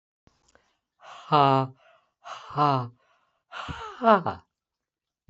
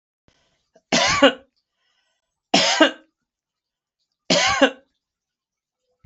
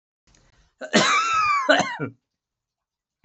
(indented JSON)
{
  "exhalation_length": "5.3 s",
  "exhalation_amplitude": 20368,
  "exhalation_signal_mean_std_ratio": 0.34,
  "three_cough_length": "6.1 s",
  "three_cough_amplitude": 27818,
  "three_cough_signal_mean_std_ratio": 0.33,
  "cough_length": "3.2 s",
  "cough_amplitude": 20797,
  "cough_signal_mean_std_ratio": 0.49,
  "survey_phase": "beta (2021-08-13 to 2022-03-07)",
  "age": "65+",
  "gender": "Male",
  "wearing_mask": "No",
  "symptom_none": true,
  "smoker_status": "Ex-smoker",
  "respiratory_condition_asthma": false,
  "respiratory_condition_other": false,
  "recruitment_source": "REACT",
  "submission_delay": "4 days",
  "covid_test_result": "Negative",
  "covid_test_method": "RT-qPCR"
}